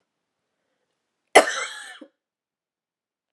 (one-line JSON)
{"cough_length": "3.3 s", "cough_amplitude": 32767, "cough_signal_mean_std_ratio": 0.18, "survey_phase": "beta (2021-08-13 to 2022-03-07)", "age": "18-44", "gender": "Female", "wearing_mask": "No", "symptom_cough_any": true, "symptom_new_continuous_cough": true, "symptom_runny_or_blocked_nose": true, "symptom_fatigue": true, "symptom_fever_high_temperature": true, "symptom_headache": true, "symptom_other": true, "symptom_onset": "6 days", "smoker_status": "Never smoked", "respiratory_condition_asthma": true, "respiratory_condition_other": false, "recruitment_source": "Test and Trace", "submission_delay": "2 days", "covid_test_result": "Positive", "covid_test_method": "RT-qPCR", "covid_ct_value": 22.7, "covid_ct_gene": "ORF1ab gene", "covid_ct_mean": 23.0, "covid_viral_load": "28000 copies/ml", "covid_viral_load_category": "Low viral load (10K-1M copies/ml)"}